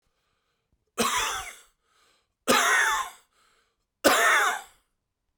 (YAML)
three_cough_length: 5.4 s
three_cough_amplitude: 22840
three_cough_signal_mean_std_ratio: 0.45
survey_phase: beta (2021-08-13 to 2022-03-07)
age: 45-64
gender: Male
wearing_mask: 'No'
symptom_none: true
smoker_status: Current smoker (e-cigarettes or vapes only)
respiratory_condition_asthma: true
respiratory_condition_other: false
recruitment_source: REACT
submission_delay: 1 day
covid_test_result: Negative
covid_test_method: RT-qPCR